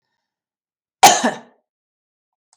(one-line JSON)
{"cough_length": "2.6 s", "cough_amplitude": 32768, "cough_signal_mean_std_ratio": 0.23, "survey_phase": "beta (2021-08-13 to 2022-03-07)", "age": "45-64", "gender": "Female", "wearing_mask": "No", "symptom_none": true, "symptom_onset": "11 days", "smoker_status": "Ex-smoker", "respiratory_condition_asthma": false, "respiratory_condition_other": false, "recruitment_source": "REACT", "submission_delay": "3 days", "covid_test_result": "Negative", "covid_test_method": "RT-qPCR", "influenza_a_test_result": "Negative", "influenza_b_test_result": "Negative"}